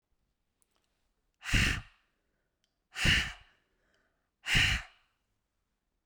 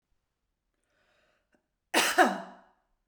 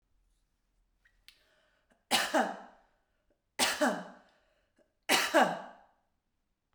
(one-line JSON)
{"exhalation_length": "6.1 s", "exhalation_amplitude": 7311, "exhalation_signal_mean_std_ratio": 0.32, "cough_length": "3.1 s", "cough_amplitude": 11923, "cough_signal_mean_std_ratio": 0.28, "three_cough_length": "6.7 s", "three_cough_amplitude": 7737, "three_cough_signal_mean_std_ratio": 0.34, "survey_phase": "beta (2021-08-13 to 2022-03-07)", "age": "65+", "gender": "Female", "wearing_mask": "No", "symptom_none": true, "smoker_status": "Never smoked", "respiratory_condition_asthma": false, "respiratory_condition_other": false, "recruitment_source": "REACT", "submission_delay": "1 day", "covid_test_result": "Negative", "covid_test_method": "RT-qPCR"}